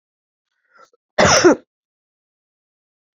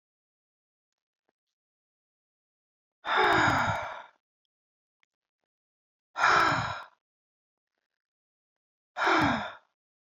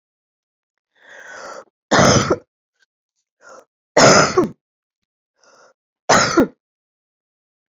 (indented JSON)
{
  "cough_length": "3.2 s",
  "cough_amplitude": 30308,
  "cough_signal_mean_std_ratio": 0.28,
  "exhalation_length": "10.2 s",
  "exhalation_amplitude": 11756,
  "exhalation_signal_mean_std_ratio": 0.35,
  "three_cough_length": "7.7 s",
  "three_cough_amplitude": 32767,
  "three_cough_signal_mean_std_ratio": 0.33,
  "survey_phase": "beta (2021-08-13 to 2022-03-07)",
  "age": "65+",
  "gender": "Female",
  "wearing_mask": "No",
  "symptom_cough_any": true,
  "symptom_new_continuous_cough": true,
  "symptom_runny_or_blocked_nose": true,
  "symptom_diarrhoea": true,
  "symptom_fatigue": true,
  "symptom_fever_high_temperature": true,
  "symptom_headache": true,
  "symptom_onset": "5 days",
  "smoker_status": "Ex-smoker",
  "respiratory_condition_asthma": false,
  "respiratory_condition_other": false,
  "recruitment_source": "Test and Trace",
  "submission_delay": "2 days",
  "covid_test_result": "Positive",
  "covid_test_method": "RT-qPCR"
}